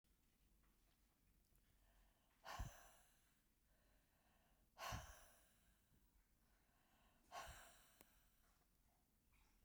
exhalation_length: 9.6 s
exhalation_amplitude: 457
exhalation_signal_mean_std_ratio: 0.4
survey_phase: beta (2021-08-13 to 2022-03-07)
age: 65+
gender: Female
wearing_mask: 'No'
symptom_none: true
smoker_status: Ex-smoker
respiratory_condition_asthma: false
respiratory_condition_other: false
recruitment_source: REACT
submission_delay: 1 day
covid_test_result: Negative
covid_test_method: RT-qPCR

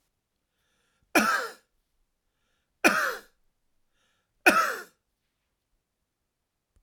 cough_length: 6.8 s
cough_amplitude: 18103
cough_signal_mean_std_ratio: 0.27
survey_phase: alpha (2021-03-01 to 2021-08-12)
age: 45-64
gender: Male
wearing_mask: 'No'
symptom_none: true
smoker_status: Never smoked
respiratory_condition_asthma: false
respiratory_condition_other: false
recruitment_source: REACT
submission_delay: 2 days
covid_test_result: Negative
covid_test_method: RT-qPCR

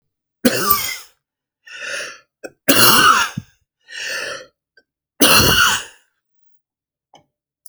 three_cough_length: 7.7 s
three_cough_amplitude: 32768
three_cough_signal_mean_std_ratio: 0.41
survey_phase: alpha (2021-03-01 to 2021-08-12)
age: 45-64
gender: Male
wearing_mask: 'No'
symptom_none: true
smoker_status: Never smoked
respiratory_condition_asthma: false
respiratory_condition_other: false
recruitment_source: REACT
submission_delay: 2 days
covid_test_result: Negative
covid_test_method: RT-qPCR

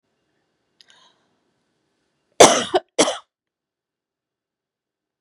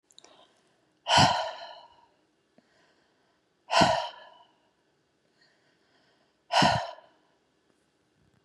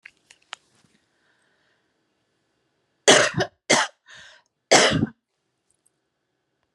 cough_length: 5.2 s
cough_amplitude: 32768
cough_signal_mean_std_ratio: 0.2
exhalation_length: 8.4 s
exhalation_amplitude: 17123
exhalation_signal_mean_std_ratio: 0.29
three_cough_length: 6.7 s
three_cough_amplitude: 32237
three_cough_signal_mean_std_ratio: 0.26
survey_phase: beta (2021-08-13 to 2022-03-07)
age: 45-64
gender: Female
wearing_mask: 'No'
symptom_cough_any: true
symptom_runny_or_blocked_nose: true
symptom_change_to_sense_of_smell_or_taste: true
smoker_status: Ex-smoker
respiratory_condition_asthma: false
respiratory_condition_other: false
recruitment_source: REACT
submission_delay: 2 days
covid_test_result: Negative
covid_test_method: RT-qPCR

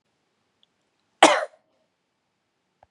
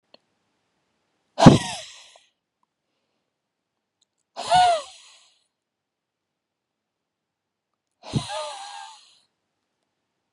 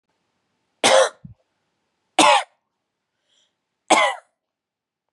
cough_length: 2.9 s
cough_amplitude: 31845
cough_signal_mean_std_ratio: 0.18
exhalation_length: 10.3 s
exhalation_amplitude: 32768
exhalation_signal_mean_std_ratio: 0.2
three_cough_length: 5.1 s
three_cough_amplitude: 31315
three_cough_signal_mean_std_ratio: 0.3
survey_phase: beta (2021-08-13 to 2022-03-07)
age: 45-64
gender: Female
wearing_mask: 'No'
symptom_runny_or_blocked_nose: true
symptom_change_to_sense_of_smell_or_taste: true
symptom_loss_of_taste: true
symptom_onset: 13 days
smoker_status: Never smoked
respiratory_condition_asthma: false
respiratory_condition_other: false
recruitment_source: REACT
submission_delay: 2 days
covid_test_result: Negative
covid_test_method: RT-qPCR
influenza_a_test_result: Negative
influenza_b_test_result: Negative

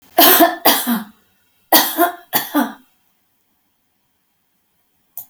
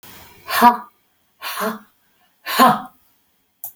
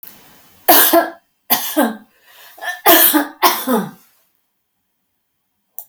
cough_length: 5.3 s
cough_amplitude: 32768
cough_signal_mean_std_ratio: 0.39
exhalation_length: 3.8 s
exhalation_amplitude: 32767
exhalation_signal_mean_std_ratio: 0.35
three_cough_length: 5.9 s
three_cough_amplitude: 32768
three_cough_signal_mean_std_ratio: 0.42
survey_phase: beta (2021-08-13 to 2022-03-07)
age: 65+
gender: Female
wearing_mask: 'No'
symptom_none: true
smoker_status: Ex-smoker
respiratory_condition_asthma: false
respiratory_condition_other: false
recruitment_source: REACT
submission_delay: 4 days
covid_test_result: Negative
covid_test_method: RT-qPCR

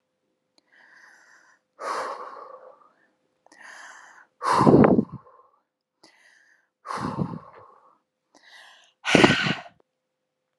exhalation_length: 10.6 s
exhalation_amplitude: 32767
exhalation_signal_mean_std_ratio: 0.3
survey_phase: beta (2021-08-13 to 2022-03-07)
age: 18-44
gender: Female
wearing_mask: 'No'
symptom_none: true
smoker_status: Never smoked
respiratory_condition_asthma: false
respiratory_condition_other: false
recruitment_source: REACT
submission_delay: 1 day
covid_test_result: Negative
covid_test_method: RT-qPCR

